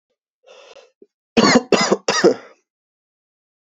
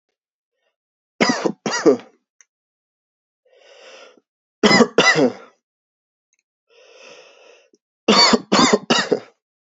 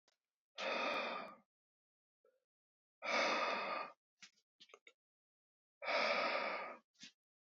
{"cough_length": "3.7 s", "cough_amplitude": 32768, "cough_signal_mean_std_ratio": 0.35, "three_cough_length": "9.7 s", "three_cough_amplitude": 29125, "three_cough_signal_mean_std_ratio": 0.35, "exhalation_length": "7.6 s", "exhalation_amplitude": 2161, "exhalation_signal_mean_std_ratio": 0.48, "survey_phase": "alpha (2021-03-01 to 2021-08-12)", "age": "18-44", "gender": "Male", "wearing_mask": "No", "symptom_fatigue": true, "symptom_headache": true, "smoker_status": "Ex-smoker", "respiratory_condition_asthma": false, "respiratory_condition_other": false, "recruitment_source": "Test and Trace", "submission_delay": "2 days", "covid_test_result": "Positive", "covid_test_method": "RT-qPCR", "covid_ct_value": 16.4, "covid_ct_gene": "ORF1ab gene", "covid_ct_mean": 16.9, "covid_viral_load": "2800000 copies/ml", "covid_viral_load_category": "High viral load (>1M copies/ml)"}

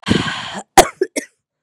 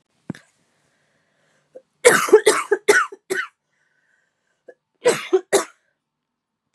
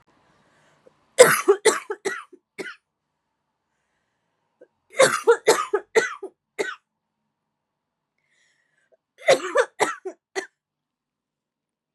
{"exhalation_length": "1.6 s", "exhalation_amplitude": 32768, "exhalation_signal_mean_std_ratio": 0.38, "cough_length": "6.7 s", "cough_amplitude": 32767, "cough_signal_mean_std_ratio": 0.31, "three_cough_length": "11.9 s", "three_cough_amplitude": 32767, "three_cough_signal_mean_std_ratio": 0.28, "survey_phase": "beta (2021-08-13 to 2022-03-07)", "age": "18-44", "gender": "Female", "wearing_mask": "No", "symptom_new_continuous_cough": true, "symptom_runny_or_blocked_nose": true, "symptom_sore_throat": true, "symptom_diarrhoea": true, "symptom_headache": true, "symptom_change_to_sense_of_smell_or_taste": true, "symptom_onset": "2 days", "smoker_status": "Never smoked", "respiratory_condition_asthma": false, "respiratory_condition_other": false, "recruitment_source": "Test and Trace", "submission_delay": "1 day", "covid_test_result": "Positive", "covid_test_method": "RT-qPCR", "covid_ct_value": 15.5, "covid_ct_gene": "ORF1ab gene", "covid_ct_mean": 15.9, "covid_viral_load": "5900000 copies/ml", "covid_viral_load_category": "High viral load (>1M copies/ml)"}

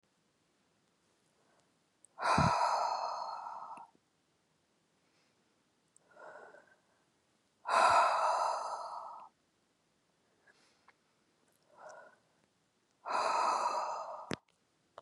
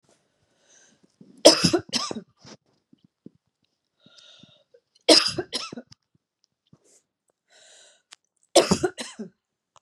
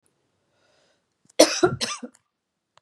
{"exhalation_length": "15.0 s", "exhalation_amplitude": 5952, "exhalation_signal_mean_std_ratio": 0.4, "three_cough_length": "9.8 s", "three_cough_amplitude": 32767, "three_cough_signal_mean_std_ratio": 0.23, "cough_length": "2.8 s", "cough_amplitude": 32678, "cough_signal_mean_std_ratio": 0.25, "survey_phase": "beta (2021-08-13 to 2022-03-07)", "age": "45-64", "gender": "Female", "wearing_mask": "No", "symptom_none": true, "smoker_status": "Never smoked", "respiratory_condition_asthma": false, "respiratory_condition_other": false, "recruitment_source": "REACT", "submission_delay": "2 days", "covid_test_result": "Negative", "covid_test_method": "RT-qPCR", "influenza_a_test_result": "Negative", "influenza_b_test_result": "Negative"}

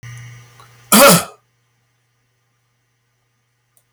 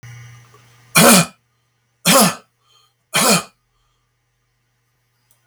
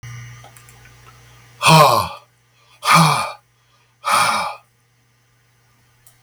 {"cough_length": "3.9 s", "cough_amplitude": 32768, "cough_signal_mean_std_ratio": 0.26, "three_cough_length": "5.5 s", "three_cough_amplitude": 32768, "three_cough_signal_mean_std_ratio": 0.34, "exhalation_length": "6.2 s", "exhalation_amplitude": 32766, "exhalation_signal_mean_std_ratio": 0.38, "survey_phase": "beta (2021-08-13 to 2022-03-07)", "age": "65+", "gender": "Male", "wearing_mask": "No", "symptom_none": true, "smoker_status": "Ex-smoker", "respiratory_condition_asthma": false, "respiratory_condition_other": false, "recruitment_source": "REACT", "submission_delay": "1 day", "covid_test_result": "Negative", "covid_test_method": "RT-qPCR", "influenza_a_test_result": "Negative", "influenza_b_test_result": "Negative"}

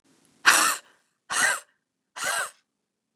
{"exhalation_length": "3.2 s", "exhalation_amplitude": 25777, "exhalation_signal_mean_std_ratio": 0.38, "survey_phase": "beta (2021-08-13 to 2022-03-07)", "age": "45-64", "gender": "Female", "wearing_mask": "No", "symptom_cough_any": true, "symptom_runny_or_blocked_nose": true, "symptom_sore_throat": true, "symptom_fatigue": true, "symptom_headache": true, "symptom_change_to_sense_of_smell_or_taste": true, "smoker_status": "Ex-smoker", "respiratory_condition_asthma": false, "respiratory_condition_other": false, "recruitment_source": "Test and Trace", "submission_delay": "1 day", "covid_test_result": "Positive", "covid_test_method": "LFT"}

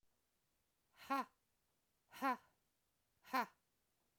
{"exhalation_length": "4.2 s", "exhalation_amplitude": 1645, "exhalation_signal_mean_std_ratio": 0.27, "survey_phase": "alpha (2021-03-01 to 2021-08-12)", "age": "45-64", "gender": "Female", "wearing_mask": "No", "symptom_none": true, "smoker_status": "Current smoker (1 to 10 cigarettes per day)", "respiratory_condition_asthma": false, "respiratory_condition_other": false, "recruitment_source": "REACT", "submission_delay": "2 days", "covid_test_result": "Negative", "covid_test_method": "RT-qPCR"}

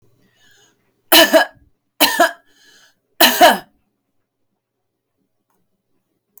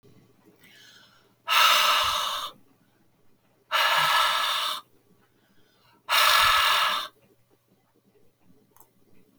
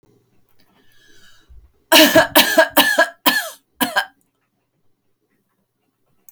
{"three_cough_length": "6.4 s", "three_cough_amplitude": 32768, "three_cough_signal_mean_std_ratio": 0.29, "exhalation_length": "9.4 s", "exhalation_amplitude": 14727, "exhalation_signal_mean_std_ratio": 0.48, "cough_length": "6.3 s", "cough_amplitude": 32768, "cough_signal_mean_std_ratio": 0.35, "survey_phase": "beta (2021-08-13 to 2022-03-07)", "age": "45-64", "gender": "Female", "wearing_mask": "No", "symptom_none": true, "smoker_status": "Never smoked", "respiratory_condition_asthma": false, "respiratory_condition_other": false, "recruitment_source": "REACT", "submission_delay": "5 days", "covid_test_result": "Negative", "covid_test_method": "RT-qPCR"}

